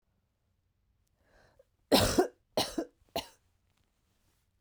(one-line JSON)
{"three_cough_length": "4.6 s", "three_cough_amplitude": 11093, "three_cough_signal_mean_std_ratio": 0.27, "survey_phase": "beta (2021-08-13 to 2022-03-07)", "age": "18-44", "gender": "Female", "wearing_mask": "No", "symptom_cough_any": true, "symptom_new_continuous_cough": true, "symptom_shortness_of_breath": true, "symptom_sore_throat": true, "symptom_fatigue": true, "symptom_fever_high_temperature": true, "symptom_headache": true, "symptom_onset": "2 days", "smoker_status": "Ex-smoker", "respiratory_condition_asthma": true, "respiratory_condition_other": false, "recruitment_source": "Test and Trace", "submission_delay": "1 day", "covid_test_result": "Positive", "covid_test_method": "RT-qPCR", "covid_ct_value": 23.1, "covid_ct_gene": "N gene"}